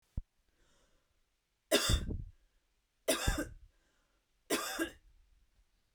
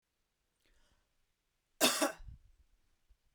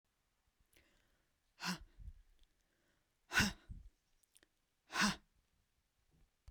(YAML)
three_cough_length: 5.9 s
three_cough_amplitude: 6116
three_cough_signal_mean_std_ratio: 0.36
cough_length: 3.3 s
cough_amplitude: 6546
cough_signal_mean_std_ratio: 0.25
exhalation_length: 6.5 s
exhalation_amplitude: 3166
exhalation_signal_mean_std_ratio: 0.26
survey_phase: beta (2021-08-13 to 2022-03-07)
age: 18-44
gender: Female
wearing_mask: 'No'
symptom_none: true
smoker_status: Ex-smoker
respiratory_condition_asthma: false
respiratory_condition_other: false
recruitment_source: REACT
submission_delay: 3 days
covid_test_result: Negative
covid_test_method: RT-qPCR